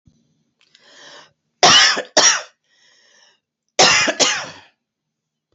{"cough_length": "5.5 s", "cough_amplitude": 32190, "cough_signal_mean_std_ratio": 0.37, "survey_phase": "beta (2021-08-13 to 2022-03-07)", "age": "45-64", "gender": "Female", "wearing_mask": "No", "symptom_none": true, "smoker_status": "Never smoked", "respiratory_condition_asthma": false, "respiratory_condition_other": false, "recruitment_source": "REACT", "submission_delay": "3 days", "covid_test_result": "Negative", "covid_test_method": "RT-qPCR", "influenza_a_test_result": "Negative", "influenza_b_test_result": "Negative"}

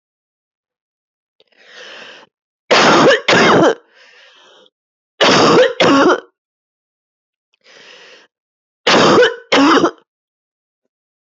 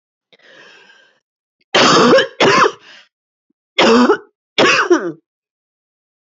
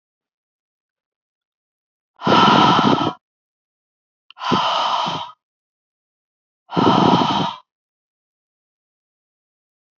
{"three_cough_length": "11.3 s", "three_cough_amplitude": 32021, "three_cough_signal_mean_std_ratio": 0.43, "cough_length": "6.2 s", "cough_amplitude": 32028, "cough_signal_mean_std_ratio": 0.45, "exhalation_length": "10.0 s", "exhalation_amplitude": 27467, "exhalation_signal_mean_std_ratio": 0.39, "survey_phase": "beta (2021-08-13 to 2022-03-07)", "age": "45-64", "gender": "Female", "wearing_mask": "No", "symptom_cough_any": true, "symptom_runny_or_blocked_nose": true, "symptom_abdominal_pain": true, "symptom_fatigue": true, "symptom_headache": true, "symptom_change_to_sense_of_smell_or_taste": true, "symptom_onset": "11 days", "smoker_status": "Ex-smoker", "respiratory_condition_asthma": false, "respiratory_condition_other": false, "recruitment_source": "Test and Trace", "submission_delay": "1 day", "covid_test_result": "Positive", "covid_test_method": "RT-qPCR", "covid_ct_value": 34.0, "covid_ct_gene": "ORF1ab gene"}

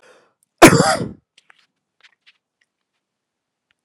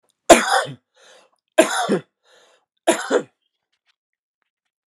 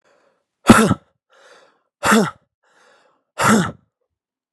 {"cough_length": "3.8 s", "cough_amplitude": 32768, "cough_signal_mean_std_ratio": 0.22, "three_cough_length": "4.9 s", "three_cough_amplitude": 32768, "three_cough_signal_mean_std_ratio": 0.3, "exhalation_length": "4.5 s", "exhalation_amplitude": 32768, "exhalation_signal_mean_std_ratio": 0.32, "survey_phase": "alpha (2021-03-01 to 2021-08-12)", "age": "45-64", "gender": "Male", "wearing_mask": "No", "symptom_cough_any": true, "symptom_shortness_of_breath": true, "symptom_abdominal_pain": true, "symptom_fever_high_temperature": true, "symptom_headache": true, "symptom_onset": "3 days", "smoker_status": "Never smoked", "respiratory_condition_asthma": false, "respiratory_condition_other": false, "recruitment_source": "Test and Trace", "submission_delay": "2 days", "covid_test_result": "Positive", "covid_test_method": "RT-qPCR"}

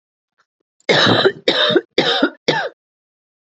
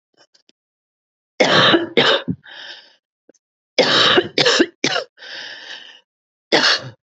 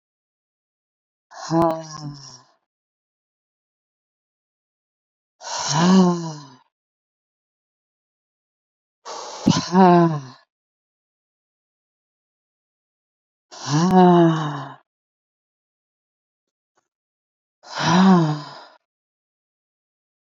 {"cough_length": "3.4 s", "cough_amplitude": 29315, "cough_signal_mean_std_ratio": 0.51, "three_cough_length": "7.2 s", "three_cough_amplitude": 28583, "three_cough_signal_mean_std_ratio": 0.45, "exhalation_length": "20.2 s", "exhalation_amplitude": 25187, "exhalation_signal_mean_std_ratio": 0.33, "survey_phase": "beta (2021-08-13 to 2022-03-07)", "age": "45-64", "gender": "Male", "wearing_mask": "No", "symptom_runny_or_blocked_nose": true, "symptom_shortness_of_breath": true, "symptom_diarrhoea": true, "symptom_fatigue": true, "symptom_headache": true, "symptom_onset": "2 days", "smoker_status": "Current smoker (e-cigarettes or vapes only)", "respiratory_condition_asthma": false, "respiratory_condition_other": false, "recruitment_source": "Test and Trace", "submission_delay": "1 day", "covid_test_result": "Positive", "covid_test_method": "RT-qPCR", "covid_ct_value": 23.7, "covid_ct_gene": "ORF1ab gene"}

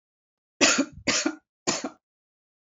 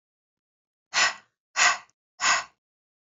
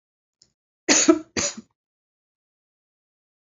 {"three_cough_length": "2.7 s", "three_cough_amplitude": 18988, "three_cough_signal_mean_std_ratio": 0.38, "exhalation_length": "3.1 s", "exhalation_amplitude": 15430, "exhalation_signal_mean_std_ratio": 0.35, "cough_length": "3.4 s", "cough_amplitude": 24861, "cough_signal_mean_std_ratio": 0.26, "survey_phase": "alpha (2021-03-01 to 2021-08-12)", "age": "45-64", "gender": "Female", "wearing_mask": "No", "symptom_fatigue": true, "smoker_status": "Never smoked", "respiratory_condition_asthma": false, "respiratory_condition_other": false, "recruitment_source": "REACT", "submission_delay": "3 days", "covid_test_result": "Negative", "covid_test_method": "RT-qPCR"}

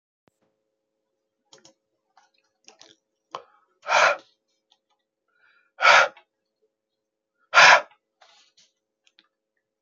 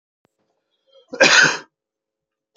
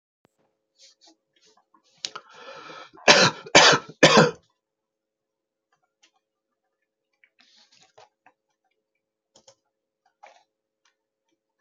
{"exhalation_length": "9.8 s", "exhalation_amplitude": 28706, "exhalation_signal_mean_std_ratio": 0.22, "cough_length": "2.6 s", "cough_amplitude": 32696, "cough_signal_mean_std_ratio": 0.3, "three_cough_length": "11.6 s", "three_cough_amplitude": 31790, "three_cough_signal_mean_std_ratio": 0.21, "survey_phase": "beta (2021-08-13 to 2022-03-07)", "age": "65+", "gender": "Male", "wearing_mask": "No", "symptom_cough_any": true, "symptom_runny_or_blocked_nose": true, "symptom_fatigue": true, "symptom_fever_high_temperature": true, "symptom_headache": true, "symptom_onset": "4 days", "smoker_status": "Ex-smoker", "respiratory_condition_asthma": false, "respiratory_condition_other": false, "recruitment_source": "Test and Trace", "submission_delay": "2 days", "covid_test_result": "Positive", "covid_test_method": "RT-qPCR", "covid_ct_value": 16.7, "covid_ct_gene": "N gene", "covid_ct_mean": 16.9, "covid_viral_load": "2900000 copies/ml", "covid_viral_load_category": "High viral load (>1M copies/ml)"}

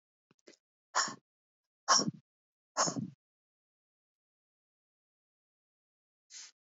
{"exhalation_length": "6.7 s", "exhalation_amplitude": 8685, "exhalation_signal_mean_std_ratio": 0.23, "survey_phase": "beta (2021-08-13 to 2022-03-07)", "age": "45-64", "gender": "Female", "wearing_mask": "No", "symptom_none": true, "smoker_status": "Ex-smoker", "respiratory_condition_asthma": false, "respiratory_condition_other": false, "recruitment_source": "REACT", "submission_delay": "1 day", "covid_test_result": "Negative", "covid_test_method": "RT-qPCR", "influenza_a_test_result": "Negative", "influenza_b_test_result": "Negative"}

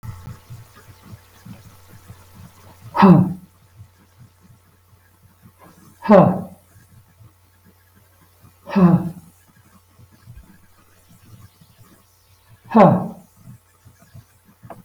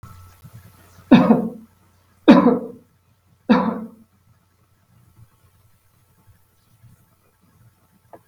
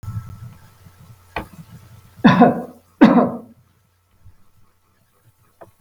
{"exhalation_length": "14.8 s", "exhalation_amplitude": 32768, "exhalation_signal_mean_std_ratio": 0.26, "three_cough_length": "8.3 s", "three_cough_amplitude": 32768, "three_cough_signal_mean_std_ratio": 0.27, "cough_length": "5.8 s", "cough_amplitude": 32768, "cough_signal_mean_std_ratio": 0.3, "survey_phase": "beta (2021-08-13 to 2022-03-07)", "age": "65+", "gender": "Male", "wearing_mask": "No", "symptom_none": true, "smoker_status": "Ex-smoker", "respiratory_condition_asthma": false, "respiratory_condition_other": false, "recruitment_source": "REACT", "submission_delay": "3 days", "covid_test_result": "Negative", "covid_test_method": "RT-qPCR", "influenza_a_test_result": "Negative", "influenza_b_test_result": "Negative"}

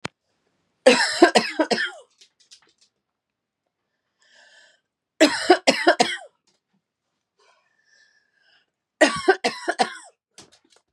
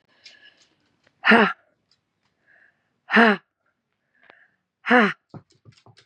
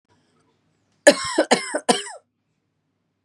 {"three_cough_length": "10.9 s", "three_cough_amplitude": 32173, "three_cough_signal_mean_std_ratio": 0.29, "exhalation_length": "6.1 s", "exhalation_amplitude": 27730, "exhalation_signal_mean_std_ratio": 0.27, "cough_length": "3.2 s", "cough_amplitude": 32748, "cough_signal_mean_std_ratio": 0.28, "survey_phase": "beta (2021-08-13 to 2022-03-07)", "age": "45-64", "gender": "Female", "wearing_mask": "No", "symptom_cough_any": true, "symptom_runny_or_blocked_nose": true, "symptom_shortness_of_breath": true, "symptom_fatigue": true, "symptom_headache": true, "smoker_status": "Ex-smoker", "respiratory_condition_asthma": false, "respiratory_condition_other": false, "recruitment_source": "Test and Trace", "submission_delay": "1 day", "covid_test_result": "Positive", "covid_test_method": "RT-qPCR", "covid_ct_value": 26.1, "covid_ct_gene": "N gene", "covid_ct_mean": 26.2, "covid_viral_load": "2500 copies/ml", "covid_viral_load_category": "Minimal viral load (< 10K copies/ml)"}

